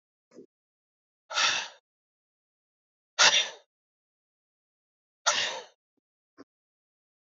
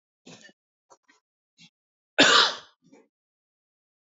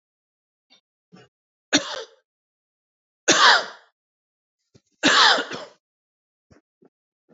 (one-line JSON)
{"exhalation_length": "7.3 s", "exhalation_amplitude": 16866, "exhalation_signal_mean_std_ratio": 0.26, "cough_length": "4.2 s", "cough_amplitude": 22683, "cough_signal_mean_std_ratio": 0.23, "three_cough_length": "7.3 s", "three_cough_amplitude": 27037, "three_cough_signal_mean_std_ratio": 0.28, "survey_phase": "beta (2021-08-13 to 2022-03-07)", "age": "45-64", "gender": "Male", "wearing_mask": "No", "symptom_cough_any": true, "symptom_onset": "6 days", "smoker_status": "Ex-smoker", "respiratory_condition_asthma": false, "respiratory_condition_other": false, "recruitment_source": "Test and Trace", "submission_delay": "3 days", "covid_test_result": "Negative", "covid_test_method": "RT-qPCR"}